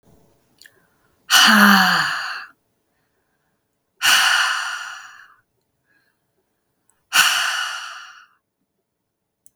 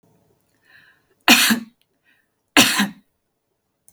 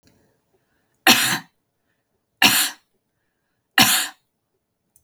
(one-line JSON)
{"exhalation_length": "9.6 s", "exhalation_amplitude": 32768, "exhalation_signal_mean_std_ratio": 0.39, "cough_length": "3.9 s", "cough_amplitude": 32768, "cough_signal_mean_std_ratio": 0.3, "three_cough_length": "5.0 s", "three_cough_amplitude": 32768, "three_cough_signal_mean_std_ratio": 0.31, "survey_phase": "beta (2021-08-13 to 2022-03-07)", "age": "45-64", "gender": "Female", "wearing_mask": "No", "symptom_cough_any": true, "symptom_runny_or_blocked_nose": true, "symptom_fatigue": true, "symptom_headache": true, "symptom_onset": "7 days", "smoker_status": "Ex-smoker", "respiratory_condition_asthma": false, "respiratory_condition_other": false, "recruitment_source": "REACT", "submission_delay": "1 day", "covid_test_result": "Negative", "covid_test_method": "RT-qPCR", "influenza_a_test_result": "Negative", "influenza_b_test_result": "Negative"}